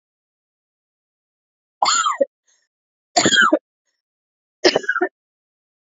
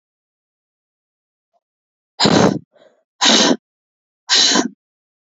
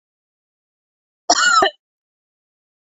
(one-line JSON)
{"three_cough_length": "5.9 s", "three_cough_amplitude": 29265, "three_cough_signal_mean_std_ratio": 0.33, "exhalation_length": "5.3 s", "exhalation_amplitude": 30977, "exhalation_signal_mean_std_ratio": 0.37, "cough_length": "2.8 s", "cough_amplitude": 28418, "cough_signal_mean_std_ratio": 0.31, "survey_phase": "beta (2021-08-13 to 2022-03-07)", "age": "18-44", "gender": "Female", "wearing_mask": "No", "symptom_cough_any": true, "symptom_runny_or_blocked_nose": true, "symptom_shortness_of_breath": true, "symptom_sore_throat": true, "symptom_fatigue": true, "symptom_headache": true, "symptom_onset": "3 days", "smoker_status": "Never smoked", "respiratory_condition_asthma": true, "respiratory_condition_other": false, "recruitment_source": "Test and Trace", "submission_delay": "2 days", "covid_test_result": "Positive", "covid_test_method": "RT-qPCR", "covid_ct_value": 15.3, "covid_ct_gene": "ORF1ab gene", "covid_ct_mean": 15.6, "covid_viral_load": "7600000 copies/ml", "covid_viral_load_category": "High viral load (>1M copies/ml)"}